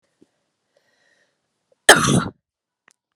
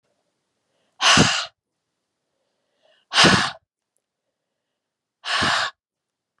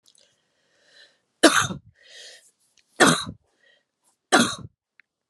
{"cough_length": "3.2 s", "cough_amplitude": 32768, "cough_signal_mean_std_ratio": 0.23, "exhalation_length": "6.4 s", "exhalation_amplitude": 31359, "exhalation_signal_mean_std_ratio": 0.33, "three_cough_length": "5.3 s", "three_cough_amplitude": 32611, "three_cough_signal_mean_std_ratio": 0.27, "survey_phase": "beta (2021-08-13 to 2022-03-07)", "age": "45-64", "gender": "Female", "wearing_mask": "No", "symptom_cough_any": true, "symptom_runny_or_blocked_nose": true, "symptom_fatigue": true, "symptom_change_to_sense_of_smell_or_taste": true, "symptom_other": true, "smoker_status": "Never smoked", "respiratory_condition_asthma": false, "respiratory_condition_other": false, "recruitment_source": "Test and Trace", "submission_delay": "2 days", "covid_test_result": "Positive", "covid_test_method": "RT-qPCR", "covid_ct_value": 15.5, "covid_ct_gene": "ORF1ab gene", "covid_ct_mean": 15.7, "covid_viral_load": "6900000 copies/ml", "covid_viral_load_category": "High viral load (>1M copies/ml)"}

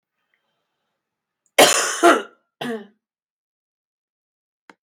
{"cough_length": "4.8 s", "cough_amplitude": 32768, "cough_signal_mean_std_ratio": 0.26, "survey_phase": "beta (2021-08-13 to 2022-03-07)", "age": "45-64", "gender": "Female", "wearing_mask": "No", "symptom_cough_any": true, "symptom_runny_or_blocked_nose": true, "symptom_onset": "3 days", "smoker_status": "Never smoked", "respiratory_condition_asthma": true, "respiratory_condition_other": false, "recruitment_source": "Test and Trace", "submission_delay": "1 day", "covid_test_result": "Positive", "covid_test_method": "RT-qPCR", "covid_ct_value": 30.9, "covid_ct_gene": "N gene"}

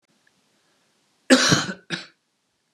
{"cough_length": "2.7 s", "cough_amplitude": 31262, "cough_signal_mean_std_ratio": 0.3, "survey_phase": "beta (2021-08-13 to 2022-03-07)", "age": "45-64", "gender": "Male", "wearing_mask": "No", "symptom_cough_any": true, "symptom_runny_or_blocked_nose": true, "symptom_fatigue": true, "symptom_headache": true, "smoker_status": "Never smoked", "respiratory_condition_asthma": false, "respiratory_condition_other": false, "recruitment_source": "Test and Trace", "submission_delay": "2 days", "covid_test_result": "Positive", "covid_test_method": "RT-qPCR", "covid_ct_value": 22.2, "covid_ct_gene": "ORF1ab gene", "covid_ct_mean": 23.3, "covid_viral_load": "22000 copies/ml", "covid_viral_load_category": "Low viral load (10K-1M copies/ml)"}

